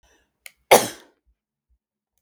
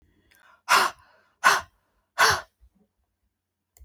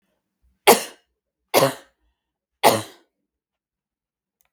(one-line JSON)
{"cough_length": "2.2 s", "cough_amplitude": 32768, "cough_signal_mean_std_ratio": 0.18, "exhalation_length": "3.8 s", "exhalation_amplitude": 21340, "exhalation_signal_mean_std_ratio": 0.31, "three_cough_length": "4.5 s", "three_cough_amplitude": 32768, "three_cough_signal_mean_std_ratio": 0.24, "survey_phase": "beta (2021-08-13 to 2022-03-07)", "age": "45-64", "gender": "Female", "wearing_mask": "No", "symptom_cough_any": true, "symptom_runny_or_blocked_nose": true, "smoker_status": "Never smoked", "respiratory_condition_asthma": false, "respiratory_condition_other": false, "recruitment_source": "Test and Trace", "submission_delay": "2 days", "covid_test_result": "Negative", "covid_test_method": "RT-qPCR"}